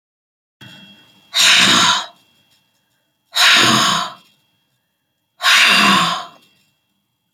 {
  "exhalation_length": "7.3 s",
  "exhalation_amplitude": 32768,
  "exhalation_signal_mean_std_ratio": 0.47,
  "survey_phase": "alpha (2021-03-01 to 2021-08-12)",
  "age": "65+",
  "gender": "Female",
  "wearing_mask": "No",
  "symptom_none": true,
  "smoker_status": "Never smoked",
  "respiratory_condition_asthma": false,
  "respiratory_condition_other": false,
  "recruitment_source": "REACT",
  "submission_delay": "2 days",
  "covid_test_result": "Negative",
  "covid_test_method": "RT-qPCR"
}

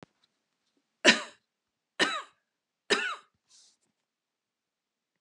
{
  "three_cough_length": "5.2 s",
  "three_cough_amplitude": 18412,
  "three_cough_signal_mean_std_ratio": 0.22,
  "survey_phase": "beta (2021-08-13 to 2022-03-07)",
  "age": "65+",
  "gender": "Female",
  "wearing_mask": "No",
  "symptom_none": true,
  "smoker_status": "Never smoked",
  "respiratory_condition_asthma": false,
  "respiratory_condition_other": false,
  "recruitment_source": "REACT",
  "submission_delay": "1 day",
  "covid_test_result": "Negative",
  "covid_test_method": "RT-qPCR"
}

